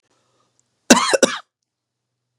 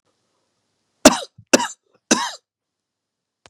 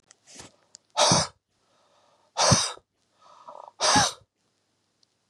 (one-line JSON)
{"cough_length": "2.4 s", "cough_amplitude": 32768, "cough_signal_mean_std_ratio": 0.26, "three_cough_length": "3.5 s", "three_cough_amplitude": 32768, "three_cough_signal_mean_std_ratio": 0.22, "exhalation_length": "5.3 s", "exhalation_amplitude": 19609, "exhalation_signal_mean_std_ratio": 0.35, "survey_phase": "beta (2021-08-13 to 2022-03-07)", "age": "45-64", "gender": "Male", "wearing_mask": "No", "symptom_cough_any": true, "symptom_runny_or_blocked_nose": true, "symptom_sore_throat": true, "symptom_fatigue": true, "symptom_headache": true, "symptom_onset": "3 days", "smoker_status": "Never smoked", "respiratory_condition_asthma": false, "respiratory_condition_other": false, "recruitment_source": "Test and Trace", "submission_delay": "1 day", "covid_test_result": "Positive", "covid_test_method": "RT-qPCR", "covid_ct_value": 22.6, "covid_ct_gene": "N gene", "covid_ct_mean": 22.8, "covid_viral_load": "32000 copies/ml", "covid_viral_load_category": "Low viral load (10K-1M copies/ml)"}